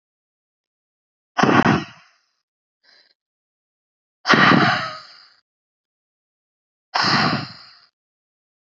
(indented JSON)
{
  "exhalation_length": "8.7 s",
  "exhalation_amplitude": 32767,
  "exhalation_signal_mean_std_ratio": 0.33,
  "survey_phase": "beta (2021-08-13 to 2022-03-07)",
  "age": "18-44",
  "gender": "Female",
  "wearing_mask": "No",
  "symptom_new_continuous_cough": true,
  "symptom_sore_throat": true,
  "symptom_diarrhoea": true,
  "symptom_fatigue": true,
  "symptom_other": true,
  "smoker_status": "Never smoked",
  "respiratory_condition_asthma": false,
  "respiratory_condition_other": false,
  "recruitment_source": "Test and Trace",
  "submission_delay": "2 days",
  "covid_test_result": "Positive",
  "covid_test_method": "RT-qPCR",
  "covid_ct_value": 30.3,
  "covid_ct_gene": "N gene"
}